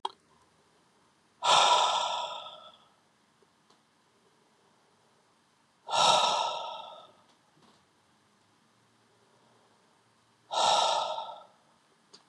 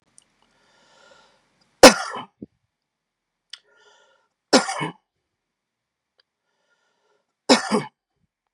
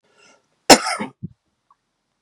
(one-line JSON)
{"exhalation_length": "12.3 s", "exhalation_amplitude": 10676, "exhalation_signal_mean_std_ratio": 0.37, "three_cough_length": "8.5 s", "three_cough_amplitude": 32768, "three_cough_signal_mean_std_ratio": 0.18, "cough_length": "2.2 s", "cough_amplitude": 32768, "cough_signal_mean_std_ratio": 0.21, "survey_phase": "beta (2021-08-13 to 2022-03-07)", "age": "45-64", "gender": "Male", "wearing_mask": "No", "symptom_none": true, "smoker_status": "Ex-smoker", "respiratory_condition_asthma": false, "respiratory_condition_other": false, "recruitment_source": "REACT", "submission_delay": "2 days", "covid_test_result": "Positive", "covid_test_method": "RT-qPCR", "covid_ct_value": 33.0, "covid_ct_gene": "N gene", "influenza_a_test_result": "Negative", "influenza_b_test_result": "Negative"}